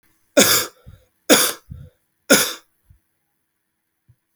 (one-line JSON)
{"three_cough_length": "4.4 s", "three_cough_amplitude": 32768, "three_cough_signal_mean_std_ratio": 0.31, "survey_phase": "alpha (2021-03-01 to 2021-08-12)", "age": "18-44", "gender": "Male", "wearing_mask": "No", "symptom_cough_any": true, "symptom_fever_high_temperature": true, "symptom_onset": "3 days", "smoker_status": "Never smoked", "respiratory_condition_asthma": false, "respiratory_condition_other": false, "recruitment_source": "Test and Trace", "submission_delay": "2 days", "covid_test_result": "Positive", "covid_test_method": "RT-qPCR", "covid_ct_value": 19.1, "covid_ct_gene": "ORF1ab gene", "covid_ct_mean": 21.3, "covid_viral_load": "100000 copies/ml", "covid_viral_load_category": "Low viral load (10K-1M copies/ml)"}